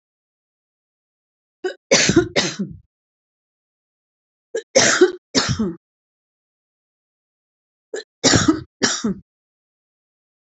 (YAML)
three_cough_length: 10.5 s
three_cough_amplitude: 32767
three_cough_signal_mean_std_ratio: 0.33
survey_phase: beta (2021-08-13 to 2022-03-07)
age: 65+
gender: Female
wearing_mask: 'No'
symptom_none: true
smoker_status: Never smoked
respiratory_condition_asthma: true
respiratory_condition_other: false
recruitment_source: REACT
submission_delay: 9 days
covid_test_result: Negative
covid_test_method: RT-qPCR
influenza_a_test_result: Negative
influenza_b_test_result: Negative